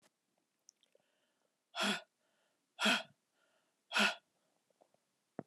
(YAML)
exhalation_length: 5.5 s
exhalation_amplitude: 4348
exhalation_signal_mean_std_ratio: 0.27
survey_phase: alpha (2021-03-01 to 2021-08-12)
age: 45-64
gender: Female
wearing_mask: 'No'
symptom_new_continuous_cough: true
symptom_fatigue: true
symptom_fever_high_temperature: true
symptom_change_to_sense_of_smell_or_taste: true
symptom_onset: 2 days
smoker_status: Current smoker (e-cigarettes or vapes only)
respiratory_condition_asthma: true
respiratory_condition_other: false
recruitment_source: Test and Trace
submission_delay: 1 day
covid_test_result: Positive
covid_test_method: RT-qPCR
covid_ct_value: 16.7
covid_ct_gene: ORF1ab gene
covid_ct_mean: 17.6
covid_viral_load: 1700000 copies/ml
covid_viral_load_category: High viral load (>1M copies/ml)